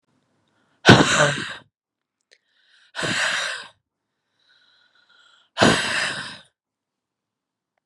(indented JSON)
{
  "exhalation_length": "7.9 s",
  "exhalation_amplitude": 32768,
  "exhalation_signal_mean_std_ratio": 0.32,
  "survey_phase": "beta (2021-08-13 to 2022-03-07)",
  "age": "18-44",
  "gender": "Female",
  "wearing_mask": "No",
  "symptom_cough_any": true,
  "symptom_runny_or_blocked_nose": true,
  "symptom_fatigue": true,
  "symptom_headache": true,
  "symptom_other": true,
  "symptom_onset": "3 days",
  "smoker_status": "Prefer not to say",
  "respiratory_condition_asthma": false,
  "respiratory_condition_other": false,
  "recruitment_source": "Test and Trace",
  "submission_delay": "2 days",
  "covid_test_result": "Positive",
  "covid_test_method": "RT-qPCR"
}